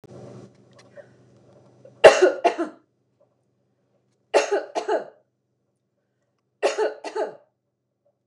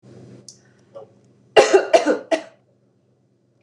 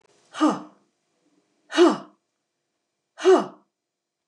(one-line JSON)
{"three_cough_length": "8.3 s", "three_cough_amplitude": 29204, "three_cough_signal_mean_std_ratio": 0.27, "cough_length": "3.6 s", "cough_amplitude": 29204, "cough_signal_mean_std_ratio": 0.31, "exhalation_length": "4.3 s", "exhalation_amplitude": 17002, "exhalation_signal_mean_std_ratio": 0.31, "survey_phase": "beta (2021-08-13 to 2022-03-07)", "age": "65+", "gender": "Female", "wearing_mask": "No", "symptom_cough_any": true, "smoker_status": "Never smoked", "respiratory_condition_asthma": false, "respiratory_condition_other": false, "recruitment_source": "REACT", "submission_delay": "7 days", "covid_test_result": "Negative", "covid_test_method": "RT-qPCR", "influenza_a_test_result": "Negative", "influenza_b_test_result": "Negative"}